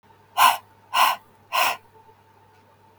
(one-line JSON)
{"exhalation_length": "3.0 s", "exhalation_amplitude": 22323, "exhalation_signal_mean_std_ratio": 0.38, "survey_phase": "beta (2021-08-13 to 2022-03-07)", "age": "18-44", "gender": "Female", "wearing_mask": "No", "symptom_none": true, "smoker_status": "Never smoked", "respiratory_condition_asthma": false, "respiratory_condition_other": false, "recruitment_source": "REACT", "submission_delay": "3 days", "covid_test_result": "Negative", "covid_test_method": "RT-qPCR", "influenza_a_test_result": "Negative", "influenza_b_test_result": "Negative"}